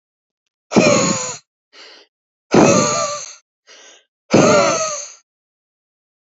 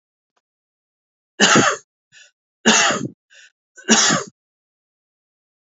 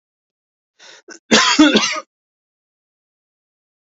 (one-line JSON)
{"exhalation_length": "6.2 s", "exhalation_amplitude": 31961, "exhalation_signal_mean_std_ratio": 0.44, "three_cough_length": "5.6 s", "three_cough_amplitude": 32768, "three_cough_signal_mean_std_ratio": 0.35, "cough_length": "3.8 s", "cough_amplitude": 32768, "cough_signal_mean_std_ratio": 0.32, "survey_phase": "beta (2021-08-13 to 2022-03-07)", "age": "18-44", "gender": "Male", "wearing_mask": "No", "symptom_sore_throat": true, "symptom_onset": "2 days", "smoker_status": "Ex-smoker", "respiratory_condition_asthma": false, "respiratory_condition_other": false, "recruitment_source": "REACT", "submission_delay": "2 days", "covid_test_result": "Negative", "covid_test_method": "RT-qPCR", "influenza_a_test_result": "Negative", "influenza_b_test_result": "Negative"}